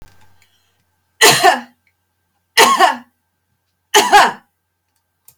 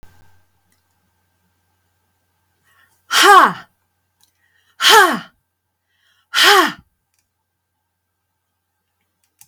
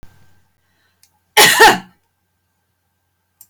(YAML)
three_cough_length: 5.4 s
three_cough_amplitude: 32768
three_cough_signal_mean_std_ratio: 0.37
exhalation_length: 9.5 s
exhalation_amplitude: 32768
exhalation_signal_mean_std_ratio: 0.27
cough_length: 3.5 s
cough_amplitude: 32768
cough_signal_mean_std_ratio: 0.28
survey_phase: beta (2021-08-13 to 2022-03-07)
age: 65+
gender: Female
wearing_mask: 'No'
symptom_none: true
smoker_status: Never smoked
respiratory_condition_asthma: false
respiratory_condition_other: false
recruitment_source: REACT
submission_delay: 5 days
covid_test_result: Negative
covid_test_method: RT-qPCR
influenza_a_test_result: Negative
influenza_b_test_result: Negative